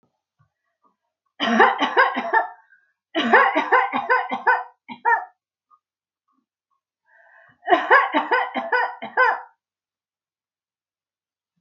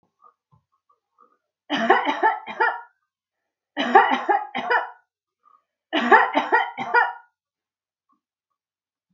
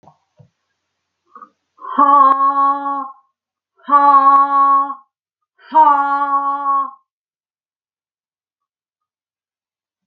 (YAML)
cough_length: 11.6 s
cough_amplitude: 27486
cough_signal_mean_std_ratio: 0.43
three_cough_length: 9.1 s
three_cough_amplitude: 26820
three_cough_signal_mean_std_ratio: 0.4
exhalation_length: 10.1 s
exhalation_amplitude: 29438
exhalation_signal_mean_std_ratio: 0.48
survey_phase: alpha (2021-03-01 to 2021-08-12)
age: 65+
gender: Female
wearing_mask: 'No'
symptom_none: true
smoker_status: Never smoked
respiratory_condition_asthma: false
respiratory_condition_other: false
recruitment_source: REACT
submission_delay: 2 days
covid_test_result: Negative
covid_test_method: RT-qPCR